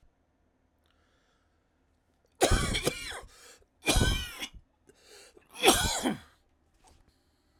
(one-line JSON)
{"three_cough_length": "7.6 s", "three_cough_amplitude": 16842, "three_cough_signal_mean_std_ratio": 0.36, "survey_phase": "alpha (2021-03-01 to 2021-08-12)", "age": "45-64", "gender": "Male", "wearing_mask": "No", "symptom_none": true, "smoker_status": "Never smoked", "respiratory_condition_asthma": false, "respiratory_condition_other": false, "recruitment_source": "REACT", "submission_delay": "2 days", "covid_test_result": "Negative", "covid_test_method": "RT-qPCR"}